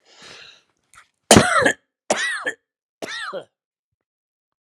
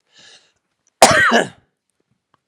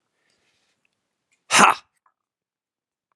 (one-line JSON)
{"three_cough_length": "4.6 s", "three_cough_amplitude": 32768, "three_cough_signal_mean_std_ratio": 0.31, "cough_length": "2.5 s", "cough_amplitude": 32768, "cough_signal_mean_std_ratio": 0.33, "exhalation_length": "3.2 s", "exhalation_amplitude": 32767, "exhalation_signal_mean_std_ratio": 0.2, "survey_phase": "alpha (2021-03-01 to 2021-08-12)", "age": "45-64", "gender": "Male", "wearing_mask": "No", "symptom_cough_any": true, "symptom_onset": "6 days", "smoker_status": "Never smoked", "respiratory_condition_asthma": false, "respiratory_condition_other": false, "recruitment_source": "Test and Trace", "submission_delay": "3 days", "covid_test_result": "Positive", "covid_test_method": "RT-qPCR", "covid_ct_value": 30.4, "covid_ct_gene": "N gene", "covid_ct_mean": 31.2, "covid_viral_load": "58 copies/ml", "covid_viral_load_category": "Minimal viral load (< 10K copies/ml)"}